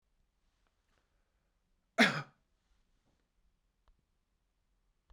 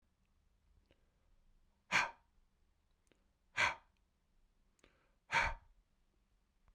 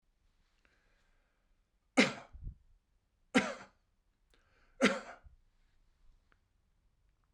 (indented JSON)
{
  "cough_length": "5.1 s",
  "cough_amplitude": 8034,
  "cough_signal_mean_std_ratio": 0.15,
  "exhalation_length": "6.7 s",
  "exhalation_amplitude": 3560,
  "exhalation_signal_mean_std_ratio": 0.24,
  "three_cough_length": "7.3 s",
  "three_cough_amplitude": 8653,
  "three_cough_signal_mean_std_ratio": 0.21,
  "survey_phase": "beta (2021-08-13 to 2022-03-07)",
  "age": "45-64",
  "gender": "Male",
  "wearing_mask": "No",
  "symptom_none": true,
  "smoker_status": "Ex-smoker",
  "respiratory_condition_asthma": false,
  "respiratory_condition_other": false,
  "recruitment_source": "REACT",
  "submission_delay": "0 days",
  "covid_test_result": "Negative",
  "covid_test_method": "RT-qPCR"
}